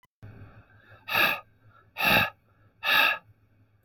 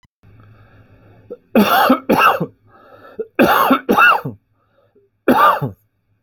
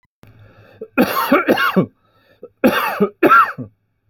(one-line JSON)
{"exhalation_length": "3.8 s", "exhalation_amplitude": 12849, "exhalation_signal_mean_std_ratio": 0.42, "three_cough_length": "6.2 s", "three_cough_amplitude": 32767, "three_cough_signal_mean_std_ratio": 0.48, "cough_length": "4.1 s", "cough_amplitude": 30834, "cough_signal_mean_std_ratio": 0.5, "survey_phase": "alpha (2021-03-01 to 2021-08-12)", "age": "45-64", "gender": "Male", "wearing_mask": "No", "symptom_none": true, "smoker_status": "Never smoked", "respiratory_condition_asthma": false, "respiratory_condition_other": false, "recruitment_source": "REACT", "submission_delay": "2 days", "covid_test_result": "Negative", "covid_test_method": "RT-qPCR"}